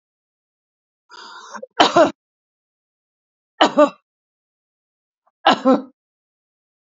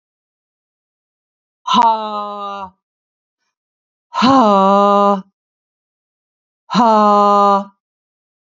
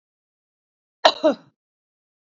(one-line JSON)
{"three_cough_length": "6.8 s", "three_cough_amplitude": 29462, "three_cough_signal_mean_std_ratio": 0.26, "exhalation_length": "8.5 s", "exhalation_amplitude": 29431, "exhalation_signal_mean_std_ratio": 0.44, "cough_length": "2.2 s", "cough_amplitude": 29343, "cough_signal_mean_std_ratio": 0.21, "survey_phase": "beta (2021-08-13 to 2022-03-07)", "age": "45-64", "gender": "Female", "wearing_mask": "No", "symptom_none": true, "smoker_status": "Ex-smoker", "respiratory_condition_asthma": false, "respiratory_condition_other": false, "recruitment_source": "REACT", "submission_delay": "2 days", "covid_test_result": "Negative", "covid_test_method": "RT-qPCR", "influenza_a_test_result": "Negative", "influenza_b_test_result": "Negative"}